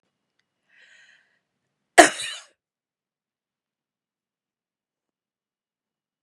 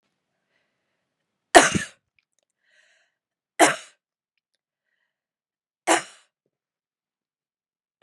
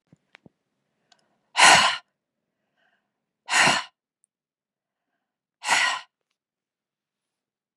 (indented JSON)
{
  "cough_length": "6.2 s",
  "cough_amplitude": 32768,
  "cough_signal_mean_std_ratio": 0.11,
  "three_cough_length": "8.0 s",
  "three_cough_amplitude": 32768,
  "three_cough_signal_mean_std_ratio": 0.17,
  "exhalation_length": "7.8 s",
  "exhalation_amplitude": 31356,
  "exhalation_signal_mean_std_ratio": 0.27,
  "survey_phase": "beta (2021-08-13 to 2022-03-07)",
  "age": "65+",
  "gender": "Female",
  "wearing_mask": "No",
  "symptom_none": true,
  "smoker_status": "Never smoked",
  "respiratory_condition_asthma": false,
  "respiratory_condition_other": false,
  "recruitment_source": "REACT",
  "submission_delay": "1 day",
  "covid_test_result": "Negative",
  "covid_test_method": "RT-qPCR",
  "influenza_a_test_result": "Negative",
  "influenza_b_test_result": "Negative"
}